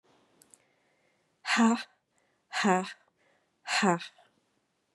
{"exhalation_length": "4.9 s", "exhalation_amplitude": 11008, "exhalation_signal_mean_std_ratio": 0.35, "survey_phase": "beta (2021-08-13 to 2022-03-07)", "age": "45-64", "gender": "Female", "wearing_mask": "No", "symptom_cough_any": true, "symptom_runny_or_blocked_nose": true, "symptom_sore_throat": true, "symptom_fatigue": true, "symptom_headache": true, "smoker_status": "Never smoked", "respiratory_condition_asthma": false, "respiratory_condition_other": false, "recruitment_source": "Test and Trace", "submission_delay": "2 days", "covid_test_result": "Positive", "covid_test_method": "RT-qPCR", "covid_ct_value": 22.0, "covid_ct_gene": "S gene", "covid_ct_mean": 22.4, "covid_viral_load": "44000 copies/ml", "covid_viral_load_category": "Low viral load (10K-1M copies/ml)"}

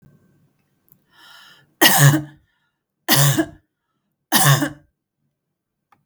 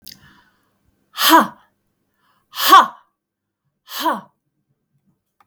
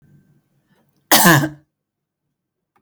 {"three_cough_length": "6.1 s", "three_cough_amplitude": 32768, "three_cough_signal_mean_std_ratio": 0.35, "exhalation_length": "5.5 s", "exhalation_amplitude": 32768, "exhalation_signal_mean_std_ratio": 0.27, "cough_length": "2.8 s", "cough_amplitude": 32768, "cough_signal_mean_std_ratio": 0.29, "survey_phase": "beta (2021-08-13 to 2022-03-07)", "age": "45-64", "gender": "Female", "wearing_mask": "No", "symptom_none": true, "smoker_status": "Never smoked", "respiratory_condition_asthma": false, "respiratory_condition_other": false, "recruitment_source": "REACT", "submission_delay": "2 days", "covid_test_result": "Negative", "covid_test_method": "RT-qPCR"}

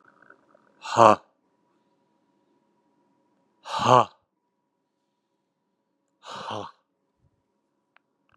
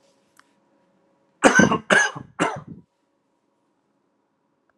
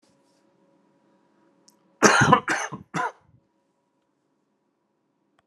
{"exhalation_length": "8.4 s", "exhalation_amplitude": 31967, "exhalation_signal_mean_std_ratio": 0.18, "three_cough_length": "4.8 s", "three_cough_amplitude": 32768, "three_cough_signal_mean_std_ratio": 0.29, "cough_length": "5.5 s", "cough_amplitude": 32021, "cough_signal_mean_std_ratio": 0.26, "survey_phase": "alpha (2021-03-01 to 2021-08-12)", "age": "18-44", "gender": "Male", "wearing_mask": "No", "symptom_cough_any": true, "symptom_new_continuous_cough": true, "symptom_fatigue": true, "symptom_change_to_sense_of_smell_or_taste": true, "symptom_loss_of_taste": true, "symptom_onset": "5 days", "smoker_status": "Never smoked", "respiratory_condition_asthma": false, "respiratory_condition_other": false, "recruitment_source": "Test and Trace", "submission_delay": "1 day", "covid_test_result": "Positive", "covid_test_method": "RT-qPCR", "covid_ct_value": 18.6, "covid_ct_gene": "S gene", "covid_ct_mean": 20.5, "covid_viral_load": "190000 copies/ml", "covid_viral_load_category": "Low viral load (10K-1M copies/ml)"}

